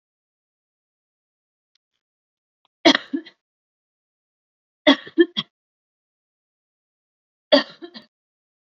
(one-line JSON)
{"three_cough_length": "8.8 s", "three_cough_amplitude": 29200, "three_cough_signal_mean_std_ratio": 0.17, "survey_phase": "beta (2021-08-13 to 2022-03-07)", "age": "18-44", "gender": "Female", "wearing_mask": "No", "symptom_none": true, "smoker_status": "Ex-smoker", "respiratory_condition_asthma": false, "respiratory_condition_other": false, "recruitment_source": "REACT", "submission_delay": "0 days", "covid_test_result": "Negative", "covid_test_method": "RT-qPCR", "influenza_a_test_result": "Negative", "influenza_b_test_result": "Negative"}